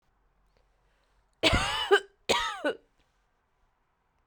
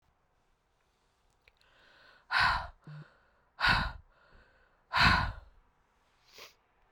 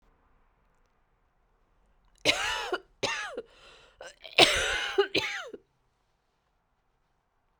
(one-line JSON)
{"cough_length": "4.3 s", "cough_amplitude": 13874, "cough_signal_mean_std_ratio": 0.34, "exhalation_length": "6.9 s", "exhalation_amplitude": 8784, "exhalation_signal_mean_std_ratio": 0.33, "three_cough_length": "7.6 s", "three_cough_amplitude": 25082, "three_cough_signal_mean_std_ratio": 0.33, "survey_phase": "beta (2021-08-13 to 2022-03-07)", "age": "45-64", "gender": "Female", "wearing_mask": "No", "symptom_shortness_of_breath": true, "symptom_abdominal_pain": true, "symptom_fatigue": true, "symptom_fever_high_temperature": true, "symptom_headache": true, "symptom_loss_of_taste": true, "symptom_onset": "3 days", "smoker_status": "Never smoked", "respiratory_condition_asthma": false, "respiratory_condition_other": false, "recruitment_source": "Test and Trace", "submission_delay": "2 days", "covid_test_result": "Positive", "covid_test_method": "RT-qPCR", "covid_ct_value": 17.8, "covid_ct_gene": "N gene", "covid_ct_mean": 18.3, "covid_viral_load": "970000 copies/ml", "covid_viral_load_category": "Low viral load (10K-1M copies/ml)"}